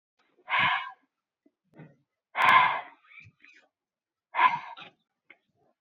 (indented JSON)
{
  "exhalation_length": "5.8 s",
  "exhalation_amplitude": 13586,
  "exhalation_signal_mean_std_ratio": 0.33,
  "survey_phase": "beta (2021-08-13 to 2022-03-07)",
  "age": "18-44",
  "gender": "Female",
  "wearing_mask": "No",
  "symptom_cough_any": true,
  "symptom_abdominal_pain": true,
  "symptom_onset": "12 days",
  "smoker_status": "Never smoked",
  "respiratory_condition_asthma": false,
  "respiratory_condition_other": false,
  "recruitment_source": "REACT",
  "submission_delay": "1 day",
  "covid_test_result": "Negative",
  "covid_test_method": "RT-qPCR",
  "influenza_a_test_result": "Positive",
  "influenza_a_ct_value": 31.5,
  "influenza_b_test_result": "Negative"
}